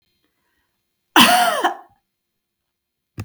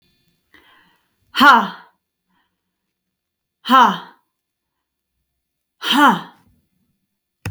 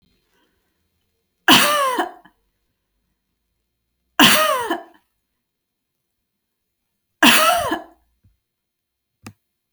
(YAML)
cough_length: 3.2 s
cough_amplitude: 32767
cough_signal_mean_std_ratio: 0.32
exhalation_length: 7.5 s
exhalation_amplitude: 30846
exhalation_signal_mean_std_ratio: 0.28
three_cough_length: 9.7 s
three_cough_amplitude: 32767
three_cough_signal_mean_std_ratio: 0.32
survey_phase: beta (2021-08-13 to 2022-03-07)
age: 18-44
gender: Female
wearing_mask: 'No'
symptom_none: true
smoker_status: Never smoked
respiratory_condition_asthma: false
respiratory_condition_other: false
recruitment_source: REACT
submission_delay: 5 days
covid_test_result: Negative
covid_test_method: RT-qPCR